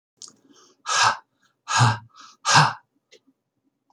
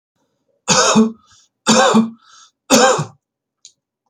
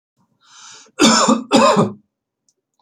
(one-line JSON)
{"exhalation_length": "3.9 s", "exhalation_amplitude": 25310, "exhalation_signal_mean_std_ratio": 0.37, "three_cough_length": "4.1 s", "three_cough_amplitude": 32768, "three_cough_signal_mean_std_ratio": 0.46, "cough_length": "2.8 s", "cough_amplitude": 32220, "cough_signal_mean_std_ratio": 0.45, "survey_phase": "beta (2021-08-13 to 2022-03-07)", "age": "45-64", "gender": "Male", "wearing_mask": "No", "symptom_fatigue": true, "symptom_headache": true, "smoker_status": "Never smoked", "respiratory_condition_asthma": false, "respiratory_condition_other": false, "recruitment_source": "Test and Trace", "submission_delay": "2 days", "covid_test_result": "Positive", "covid_test_method": "LFT"}